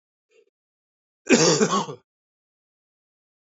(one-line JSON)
{"cough_length": "3.5 s", "cough_amplitude": 24253, "cough_signal_mean_std_ratio": 0.31, "survey_phase": "alpha (2021-03-01 to 2021-08-12)", "age": "45-64", "gender": "Male", "wearing_mask": "No", "symptom_cough_any": true, "symptom_shortness_of_breath": true, "symptom_abdominal_pain": true, "symptom_loss_of_taste": true, "symptom_onset": "4 days", "smoker_status": "Never smoked", "respiratory_condition_asthma": false, "respiratory_condition_other": false, "recruitment_source": "Test and Trace", "submission_delay": "2 days", "covid_test_result": "Positive", "covid_test_method": "RT-qPCR", "covid_ct_value": 13.1, "covid_ct_gene": "ORF1ab gene", "covid_ct_mean": 13.3, "covid_viral_load": "44000000 copies/ml", "covid_viral_load_category": "High viral load (>1M copies/ml)"}